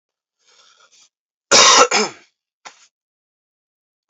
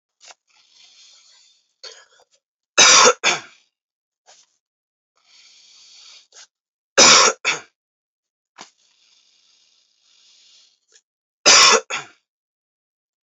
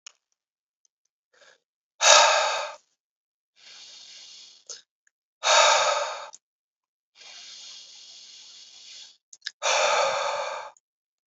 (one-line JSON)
{"cough_length": "4.1 s", "cough_amplitude": 32768, "cough_signal_mean_std_ratio": 0.29, "three_cough_length": "13.2 s", "three_cough_amplitude": 32768, "three_cough_signal_mean_std_ratio": 0.26, "exhalation_length": "11.3 s", "exhalation_amplitude": 29077, "exhalation_signal_mean_std_ratio": 0.37, "survey_phase": "alpha (2021-03-01 to 2021-08-12)", "age": "18-44", "gender": "Male", "wearing_mask": "No", "symptom_fever_high_temperature": true, "symptom_headache": true, "symptom_change_to_sense_of_smell_or_taste": true, "symptom_onset": "3 days", "smoker_status": "Current smoker (1 to 10 cigarettes per day)", "respiratory_condition_asthma": false, "respiratory_condition_other": false, "recruitment_source": "Test and Trace", "submission_delay": "2 days", "covid_test_result": "Positive", "covid_test_method": "RT-qPCR"}